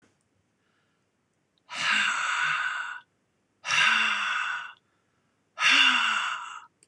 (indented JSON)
{
  "exhalation_length": "6.9 s",
  "exhalation_amplitude": 15640,
  "exhalation_signal_mean_std_ratio": 0.56,
  "survey_phase": "beta (2021-08-13 to 2022-03-07)",
  "age": "65+",
  "gender": "Male",
  "wearing_mask": "No",
  "symptom_none": true,
  "smoker_status": "Never smoked",
  "respiratory_condition_asthma": false,
  "respiratory_condition_other": false,
  "recruitment_source": "REACT",
  "submission_delay": "2 days",
  "covid_test_result": "Negative",
  "covid_test_method": "RT-qPCR",
  "influenza_a_test_result": "Negative",
  "influenza_b_test_result": "Negative"
}